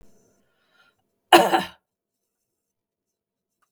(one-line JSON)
{"cough_length": "3.7 s", "cough_amplitude": 32767, "cough_signal_mean_std_ratio": 0.2, "survey_phase": "beta (2021-08-13 to 2022-03-07)", "age": "65+", "gender": "Female", "wearing_mask": "No", "symptom_none": true, "smoker_status": "Ex-smoker", "respiratory_condition_asthma": false, "respiratory_condition_other": false, "recruitment_source": "REACT", "submission_delay": "1 day", "covid_test_result": "Negative", "covid_test_method": "RT-qPCR", "influenza_a_test_result": "Negative", "influenza_b_test_result": "Negative"}